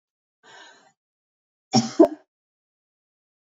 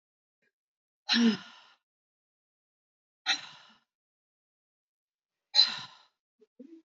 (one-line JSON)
{"cough_length": "3.6 s", "cough_amplitude": 25673, "cough_signal_mean_std_ratio": 0.19, "exhalation_length": "7.0 s", "exhalation_amplitude": 12236, "exhalation_signal_mean_std_ratio": 0.24, "survey_phase": "beta (2021-08-13 to 2022-03-07)", "age": "45-64", "gender": "Female", "wearing_mask": "No", "symptom_runny_or_blocked_nose": true, "smoker_status": "Never smoked", "respiratory_condition_asthma": false, "respiratory_condition_other": false, "recruitment_source": "Test and Trace", "submission_delay": "1 day", "covid_test_result": "Positive", "covid_test_method": "RT-qPCR", "covid_ct_value": 29.9, "covid_ct_gene": "ORF1ab gene", "covid_ct_mean": 30.4, "covid_viral_load": "110 copies/ml", "covid_viral_load_category": "Minimal viral load (< 10K copies/ml)"}